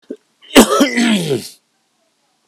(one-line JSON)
{"cough_length": "2.5 s", "cough_amplitude": 32768, "cough_signal_mean_std_ratio": 0.45, "survey_phase": "beta (2021-08-13 to 2022-03-07)", "age": "45-64", "gender": "Male", "wearing_mask": "No", "symptom_cough_any": true, "smoker_status": "Never smoked", "respiratory_condition_asthma": false, "respiratory_condition_other": false, "recruitment_source": "Test and Trace", "submission_delay": "1 day", "covid_test_result": "Positive", "covid_test_method": "RT-qPCR", "covid_ct_value": 23.3, "covid_ct_gene": "ORF1ab gene"}